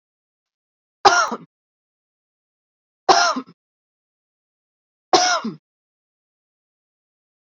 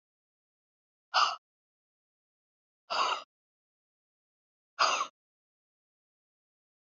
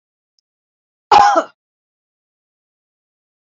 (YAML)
three_cough_length: 7.4 s
three_cough_amplitude: 29292
three_cough_signal_mean_std_ratio: 0.26
exhalation_length: 6.9 s
exhalation_amplitude: 7378
exhalation_signal_mean_std_ratio: 0.25
cough_length: 3.5 s
cough_amplitude: 28557
cough_signal_mean_std_ratio: 0.24
survey_phase: beta (2021-08-13 to 2022-03-07)
age: 45-64
gender: Female
wearing_mask: 'No'
symptom_none: true
smoker_status: Never smoked
respiratory_condition_asthma: false
respiratory_condition_other: false
recruitment_source: REACT
submission_delay: 1 day
covid_test_result: Negative
covid_test_method: RT-qPCR
influenza_a_test_result: Negative
influenza_b_test_result: Negative